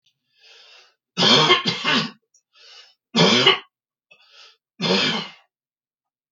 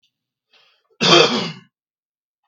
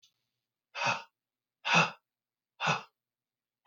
three_cough_length: 6.3 s
three_cough_amplitude: 32766
three_cough_signal_mean_std_ratio: 0.42
cough_length: 2.5 s
cough_amplitude: 32768
cough_signal_mean_std_ratio: 0.33
exhalation_length: 3.7 s
exhalation_amplitude: 10055
exhalation_signal_mean_std_ratio: 0.31
survey_phase: beta (2021-08-13 to 2022-03-07)
age: 45-64
gender: Male
wearing_mask: 'No'
symptom_none: true
smoker_status: Prefer not to say
respiratory_condition_asthma: false
respiratory_condition_other: false
recruitment_source: REACT
submission_delay: 3 days
covid_test_result: Negative
covid_test_method: RT-qPCR
influenza_a_test_result: Negative
influenza_b_test_result: Negative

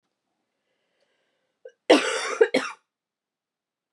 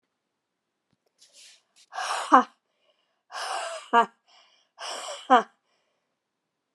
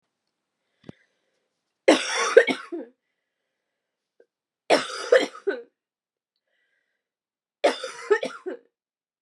cough_length: 3.9 s
cough_amplitude: 25879
cough_signal_mean_std_ratio: 0.26
exhalation_length: 6.7 s
exhalation_amplitude: 28229
exhalation_signal_mean_std_ratio: 0.25
three_cough_length: 9.2 s
three_cough_amplitude: 30883
three_cough_signal_mean_std_ratio: 0.28
survey_phase: beta (2021-08-13 to 2022-03-07)
age: 18-44
gender: Female
wearing_mask: 'No'
symptom_cough_any: true
symptom_fatigue: true
symptom_fever_high_temperature: true
symptom_headache: true
symptom_change_to_sense_of_smell_or_taste: true
symptom_loss_of_taste: true
symptom_onset: 2 days
smoker_status: Never smoked
respiratory_condition_asthma: false
respiratory_condition_other: false
recruitment_source: Test and Trace
submission_delay: 1 day
covid_test_result: Positive
covid_test_method: RT-qPCR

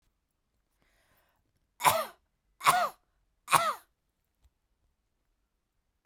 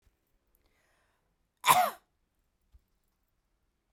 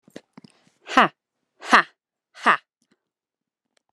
three_cough_length: 6.1 s
three_cough_amplitude: 17194
three_cough_signal_mean_std_ratio: 0.25
cough_length: 3.9 s
cough_amplitude: 14107
cough_signal_mean_std_ratio: 0.19
exhalation_length: 3.9 s
exhalation_amplitude: 32767
exhalation_signal_mean_std_ratio: 0.21
survey_phase: beta (2021-08-13 to 2022-03-07)
age: 18-44
gender: Female
wearing_mask: 'No'
symptom_cough_any: true
smoker_status: Never smoked
respiratory_condition_asthma: false
respiratory_condition_other: false
recruitment_source: Test and Trace
submission_delay: 2 days
covid_test_result: Positive
covid_test_method: RT-qPCR
covid_ct_value: 27.9
covid_ct_gene: ORF1ab gene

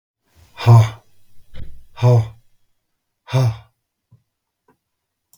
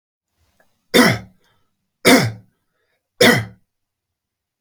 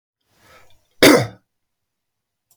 exhalation_length: 5.4 s
exhalation_amplitude: 32644
exhalation_signal_mean_std_ratio: 0.33
three_cough_length: 4.6 s
three_cough_amplitude: 32768
three_cough_signal_mean_std_ratio: 0.31
cough_length: 2.6 s
cough_amplitude: 32768
cough_signal_mean_std_ratio: 0.24
survey_phase: beta (2021-08-13 to 2022-03-07)
age: 65+
gender: Male
wearing_mask: 'No'
symptom_none: true
symptom_onset: 12 days
smoker_status: Never smoked
respiratory_condition_asthma: false
respiratory_condition_other: false
recruitment_source: REACT
submission_delay: 1 day
covid_test_result: Negative
covid_test_method: RT-qPCR
influenza_a_test_result: Negative
influenza_b_test_result: Negative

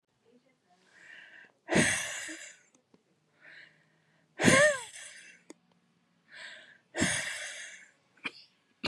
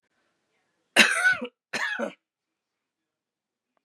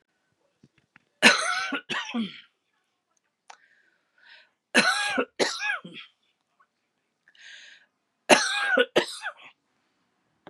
exhalation_length: 8.9 s
exhalation_amplitude: 15507
exhalation_signal_mean_std_ratio: 0.33
cough_length: 3.8 s
cough_amplitude: 29576
cough_signal_mean_std_ratio: 0.31
three_cough_length: 10.5 s
three_cough_amplitude: 31466
three_cough_signal_mean_std_ratio: 0.34
survey_phase: beta (2021-08-13 to 2022-03-07)
age: 45-64
gender: Female
wearing_mask: 'No'
symptom_runny_or_blocked_nose: true
symptom_shortness_of_breath: true
symptom_sore_throat: true
symptom_fatigue: true
symptom_headache: true
symptom_onset: 2 days
smoker_status: Never smoked
respiratory_condition_asthma: false
respiratory_condition_other: false
recruitment_source: Test and Trace
submission_delay: 2 days
covid_test_result: Positive
covid_test_method: RT-qPCR
covid_ct_value: 27.8
covid_ct_gene: ORF1ab gene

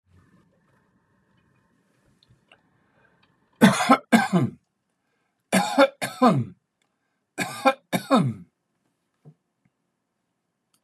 three_cough_length: 10.8 s
three_cough_amplitude: 25417
three_cough_signal_mean_std_ratio: 0.3
survey_phase: beta (2021-08-13 to 2022-03-07)
age: 65+
gender: Male
wearing_mask: 'No'
symptom_none: true
smoker_status: Never smoked
respiratory_condition_asthma: false
respiratory_condition_other: false
recruitment_source: REACT
submission_delay: 2 days
covid_test_result: Negative
covid_test_method: RT-qPCR
influenza_a_test_result: Negative
influenza_b_test_result: Negative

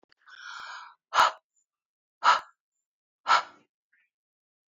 exhalation_length: 4.7 s
exhalation_amplitude: 14794
exhalation_signal_mean_std_ratio: 0.27
survey_phase: beta (2021-08-13 to 2022-03-07)
age: 18-44
gender: Female
wearing_mask: 'No'
symptom_none: true
smoker_status: Never smoked
respiratory_condition_asthma: false
respiratory_condition_other: false
recruitment_source: REACT
submission_delay: 1 day
covid_test_result: Negative
covid_test_method: RT-qPCR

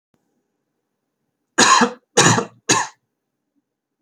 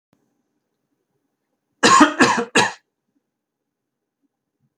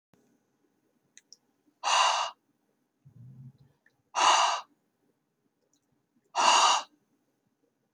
three_cough_length: 4.0 s
three_cough_amplitude: 32768
three_cough_signal_mean_std_ratio: 0.34
cough_length: 4.8 s
cough_amplitude: 31985
cough_signal_mean_std_ratio: 0.29
exhalation_length: 7.9 s
exhalation_amplitude: 13045
exhalation_signal_mean_std_ratio: 0.34
survey_phase: alpha (2021-03-01 to 2021-08-12)
age: 18-44
gender: Male
wearing_mask: 'No'
symptom_none: true
smoker_status: Never smoked
respiratory_condition_asthma: false
respiratory_condition_other: false
recruitment_source: REACT
submission_delay: 2 days
covid_test_result: Negative
covid_test_method: RT-qPCR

